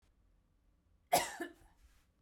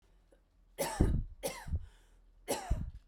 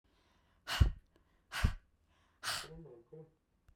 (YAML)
cough_length: 2.2 s
cough_amplitude: 4396
cough_signal_mean_std_ratio: 0.26
three_cough_length: 3.1 s
three_cough_amplitude: 9430
three_cough_signal_mean_std_ratio: 0.48
exhalation_length: 3.8 s
exhalation_amplitude: 6214
exhalation_signal_mean_std_ratio: 0.29
survey_phase: beta (2021-08-13 to 2022-03-07)
age: 18-44
gender: Female
wearing_mask: 'No'
symptom_none: true
smoker_status: Never smoked
respiratory_condition_asthma: false
respiratory_condition_other: false
recruitment_source: REACT
submission_delay: 1 day
covid_test_result: Negative
covid_test_method: RT-qPCR
influenza_a_test_result: Unknown/Void
influenza_b_test_result: Unknown/Void